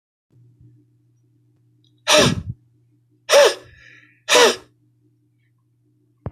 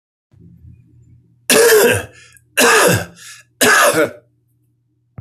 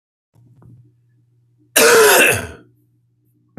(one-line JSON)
{"exhalation_length": "6.3 s", "exhalation_amplitude": 30523, "exhalation_signal_mean_std_ratio": 0.3, "three_cough_length": "5.2 s", "three_cough_amplitude": 32768, "three_cough_signal_mean_std_ratio": 0.48, "cough_length": "3.6 s", "cough_amplitude": 32768, "cough_signal_mean_std_ratio": 0.38, "survey_phase": "alpha (2021-03-01 to 2021-08-12)", "age": "65+", "gender": "Male", "wearing_mask": "No", "symptom_none": true, "smoker_status": "Ex-smoker", "respiratory_condition_asthma": false, "respiratory_condition_other": false, "recruitment_source": "REACT", "submission_delay": "4 days", "covid_test_result": "Negative", "covid_test_method": "RT-qPCR"}